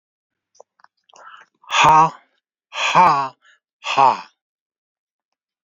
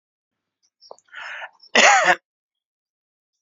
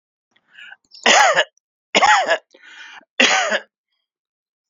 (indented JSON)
{
  "exhalation_length": "5.6 s",
  "exhalation_amplitude": 28219,
  "exhalation_signal_mean_std_ratio": 0.36,
  "cough_length": "3.4 s",
  "cough_amplitude": 29458,
  "cough_signal_mean_std_ratio": 0.29,
  "three_cough_length": "4.7 s",
  "three_cough_amplitude": 32767,
  "three_cough_signal_mean_std_ratio": 0.41,
  "survey_phase": "alpha (2021-03-01 to 2021-08-12)",
  "age": "65+",
  "gender": "Male",
  "wearing_mask": "No",
  "symptom_none": true,
  "smoker_status": "Never smoked",
  "respiratory_condition_asthma": false,
  "respiratory_condition_other": false,
  "recruitment_source": "REACT",
  "submission_delay": "2 days",
  "covid_test_result": "Negative",
  "covid_test_method": "RT-qPCR"
}